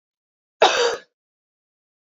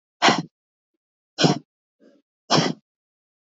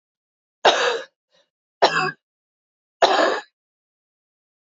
cough_length: 2.1 s
cough_amplitude: 27555
cough_signal_mean_std_ratio: 0.29
exhalation_length: 3.4 s
exhalation_amplitude: 25196
exhalation_signal_mean_std_ratio: 0.31
three_cough_length: 4.7 s
three_cough_amplitude: 26952
three_cough_signal_mean_std_ratio: 0.35
survey_phase: beta (2021-08-13 to 2022-03-07)
age: 18-44
gender: Female
wearing_mask: 'No'
symptom_cough_any: true
symptom_runny_or_blocked_nose: true
symptom_sore_throat: true
smoker_status: Never smoked
respiratory_condition_asthma: false
respiratory_condition_other: false
recruitment_source: REACT
submission_delay: 1 day
covid_test_result: Positive
covid_test_method: RT-qPCR
covid_ct_value: 28.0
covid_ct_gene: E gene
influenza_a_test_result: Negative
influenza_b_test_result: Negative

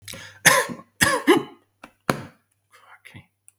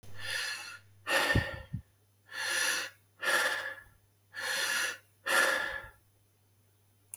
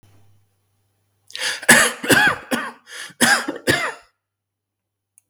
three_cough_length: 3.6 s
three_cough_amplitude: 32768
three_cough_signal_mean_std_ratio: 0.34
exhalation_length: 7.2 s
exhalation_amplitude: 7395
exhalation_signal_mean_std_ratio: 0.58
cough_length: 5.3 s
cough_amplitude: 32768
cough_signal_mean_std_ratio: 0.4
survey_phase: beta (2021-08-13 to 2022-03-07)
age: 45-64
gender: Male
wearing_mask: 'No'
symptom_none: true
symptom_onset: 6 days
smoker_status: Never smoked
respiratory_condition_asthma: false
respiratory_condition_other: false
recruitment_source: REACT
submission_delay: 1 day
covid_test_result: Negative
covid_test_method: RT-qPCR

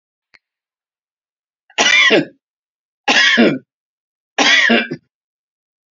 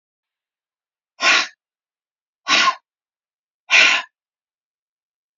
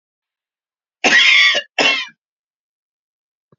three_cough_length: 6.0 s
three_cough_amplitude: 32767
three_cough_signal_mean_std_ratio: 0.42
exhalation_length: 5.4 s
exhalation_amplitude: 30205
exhalation_signal_mean_std_ratio: 0.3
cough_length: 3.6 s
cough_amplitude: 30459
cough_signal_mean_std_ratio: 0.4
survey_phase: beta (2021-08-13 to 2022-03-07)
age: 65+
gender: Female
wearing_mask: 'No'
symptom_none: true
smoker_status: Ex-smoker
respiratory_condition_asthma: false
respiratory_condition_other: false
recruitment_source: REACT
submission_delay: 0 days
covid_test_result: Negative
covid_test_method: RT-qPCR
influenza_a_test_result: Negative
influenza_b_test_result: Negative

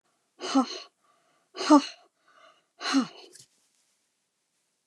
exhalation_length: 4.9 s
exhalation_amplitude: 19109
exhalation_signal_mean_std_ratio: 0.26
survey_phase: beta (2021-08-13 to 2022-03-07)
age: 65+
gender: Female
wearing_mask: 'No'
symptom_none: true
smoker_status: Ex-smoker
respiratory_condition_asthma: false
respiratory_condition_other: false
recruitment_source: REACT
submission_delay: 2 days
covid_test_result: Negative
covid_test_method: RT-qPCR
influenza_a_test_result: Negative
influenza_b_test_result: Negative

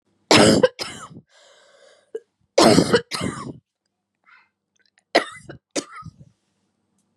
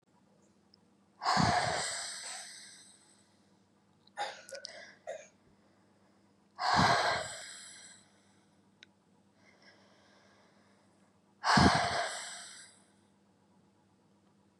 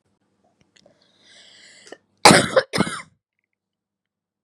three_cough_length: 7.2 s
three_cough_amplitude: 32412
three_cough_signal_mean_std_ratio: 0.31
exhalation_length: 14.6 s
exhalation_amplitude: 8802
exhalation_signal_mean_std_ratio: 0.36
cough_length: 4.4 s
cough_amplitude: 32768
cough_signal_mean_std_ratio: 0.23
survey_phase: beta (2021-08-13 to 2022-03-07)
age: 18-44
gender: Female
wearing_mask: 'No'
symptom_cough_any: true
symptom_runny_or_blocked_nose: true
symptom_shortness_of_breath: true
symptom_diarrhoea: true
symptom_onset: 6 days
smoker_status: Never smoked
respiratory_condition_asthma: false
respiratory_condition_other: true
recruitment_source: REACT
submission_delay: 1 day
covid_test_result: Negative
covid_test_method: RT-qPCR
influenza_a_test_result: Negative
influenza_b_test_result: Negative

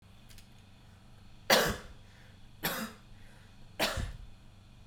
three_cough_length: 4.9 s
three_cough_amplitude: 11047
three_cough_signal_mean_std_ratio: 0.41
survey_phase: beta (2021-08-13 to 2022-03-07)
age: 18-44
gender: Female
wearing_mask: 'Yes'
symptom_none: true
smoker_status: Never smoked
respiratory_condition_asthma: false
respiratory_condition_other: false
recruitment_source: REACT
submission_delay: 0 days
covid_test_result: Negative
covid_test_method: RT-qPCR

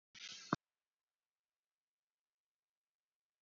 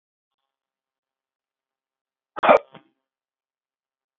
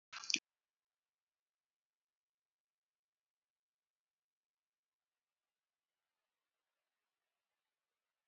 cough_length: 3.4 s
cough_amplitude: 4453
cough_signal_mean_std_ratio: 0.13
exhalation_length: 4.2 s
exhalation_amplitude: 27228
exhalation_signal_mean_std_ratio: 0.15
three_cough_length: 8.3 s
three_cough_amplitude: 6156
three_cough_signal_mean_std_ratio: 0.07
survey_phase: beta (2021-08-13 to 2022-03-07)
age: 45-64
gender: Male
wearing_mask: 'No'
symptom_cough_any: true
symptom_abdominal_pain: true
smoker_status: Never smoked
respiratory_condition_asthma: false
respiratory_condition_other: false
recruitment_source: REACT
submission_delay: 2 days
covid_test_result: Negative
covid_test_method: RT-qPCR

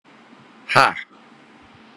exhalation_length: 2.0 s
exhalation_amplitude: 32767
exhalation_signal_mean_std_ratio: 0.27
survey_phase: beta (2021-08-13 to 2022-03-07)
age: 18-44
gender: Male
wearing_mask: 'No'
symptom_none: true
smoker_status: Current smoker (1 to 10 cigarettes per day)
respiratory_condition_asthma: false
respiratory_condition_other: false
recruitment_source: REACT
submission_delay: 1 day
covid_test_result: Negative
covid_test_method: RT-qPCR
influenza_a_test_result: Negative
influenza_b_test_result: Negative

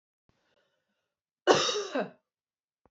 cough_length: 2.9 s
cough_amplitude: 15811
cough_signal_mean_std_ratio: 0.3
survey_phase: beta (2021-08-13 to 2022-03-07)
age: 18-44
gender: Female
wearing_mask: 'No'
symptom_cough_any: true
symptom_runny_or_blocked_nose: true
symptom_shortness_of_breath: true
symptom_sore_throat: true
symptom_fatigue: true
symptom_headache: true
symptom_change_to_sense_of_smell_or_taste: true
symptom_loss_of_taste: true
symptom_other: true
symptom_onset: 2 days
smoker_status: Never smoked
respiratory_condition_asthma: false
respiratory_condition_other: true
recruitment_source: Test and Trace
submission_delay: 2 days
covid_test_result: Positive
covid_test_method: RT-qPCR
covid_ct_value: 20.7
covid_ct_gene: N gene
covid_ct_mean: 20.8
covid_viral_load: 150000 copies/ml
covid_viral_load_category: Low viral load (10K-1M copies/ml)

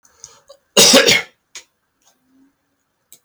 cough_length: 3.2 s
cough_amplitude: 32768
cough_signal_mean_std_ratio: 0.31
survey_phase: beta (2021-08-13 to 2022-03-07)
age: 65+
gender: Male
wearing_mask: 'No'
symptom_none: true
smoker_status: Ex-smoker
respiratory_condition_asthma: false
respiratory_condition_other: false
recruitment_source: REACT
submission_delay: 1 day
covid_test_result: Negative
covid_test_method: RT-qPCR
influenza_a_test_result: Negative
influenza_b_test_result: Negative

